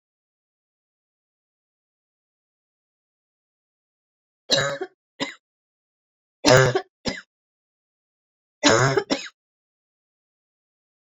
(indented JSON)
{
  "three_cough_length": "11.0 s",
  "three_cough_amplitude": 26606,
  "three_cough_signal_mean_std_ratio": 0.25,
  "survey_phase": "beta (2021-08-13 to 2022-03-07)",
  "age": "45-64",
  "gender": "Female",
  "wearing_mask": "No",
  "symptom_cough_any": true,
  "symptom_fatigue": true,
  "symptom_headache": true,
  "symptom_change_to_sense_of_smell_or_taste": true,
  "symptom_loss_of_taste": true,
  "symptom_onset": "5 days",
  "smoker_status": "Never smoked",
  "respiratory_condition_asthma": false,
  "respiratory_condition_other": false,
  "recruitment_source": "Test and Trace",
  "submission_delay": "2 days",
  "covid_test_result": "Positive",
  "covid_test_method": "RT-qPCR",
  "covid_ct_value": 17.6,
  "covid_ct_gene": "ORF1ab gene",
  "covid_ct_mean": 17.9,
  "covid_viral_load": "1400000 copies/ml",
  "covid_viral_load_category": "High viral load (>1M copies/ml)"
}